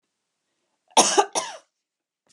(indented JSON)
{
  "cough_length": "2.3 s",
  "cough_amplitude": 25912,
  "cough_signal_mean_std_ratio": 0.29,
  "survey_phase": "beta (2021-08-13 to 2022-03-07)",
  "age": "45-64",
  "gender": "Female",
  "wearing_mask": "No",
  "symptom_none": true,
  "smoker_status": "Ex-smoker",
  "respiratory_condition_asthma": false,
  "respiratory_condition_other": false,
  "recruitment_source": "REACT",
  "submission_delay": "1 day",
  "covid_test_result": "Negative",
  "covid_test_method": "RT-qPCR",
  "influenza_a_test_result": "Negative",
  "influenza_b_test_result": "Negative"
}